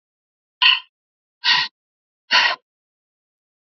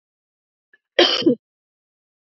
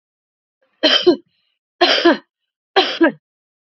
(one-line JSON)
{"exhalation_length": "3.7 s", "exhalation_amplitude": 28400, "exhalation_signal_mean_std_ratio": 0.32, "cough_length": "2.3 s", "cough_amplitude": 28603, "cough_signal_mean_std_ratio": 0.28, "three_cough_length": "3.7 s", "three_cough_amplitude": 29234, "three_cough_signal_mean_std_ratio": 0.4, "survey_phase": "beta (2021-08-13 to 2022-03-07)", "age": "45-64", "gender": "Female", "wearing_mask": "No", "symptom_cough_any": true, "symptom_new_continuous_cough": true, "symptom_runny_or_blocked_nose": true, "symptom_abdominal_pain": true, "symptom_fatigue": true, "symptom_change_to_sense_of_smell_or_taste": true, "symptom_loss_of_taste": true, "symptom_onset": "3 days", "smoker_status": "Ex-smoker", "respiratory_condition_asthma": false, "respiratory_condition_other": false, "recruitment_source": "Test and Trace", "submission_delay": "1 day", "covid_test_result": "Positive", "covid_test_method": "RT-qPCR"}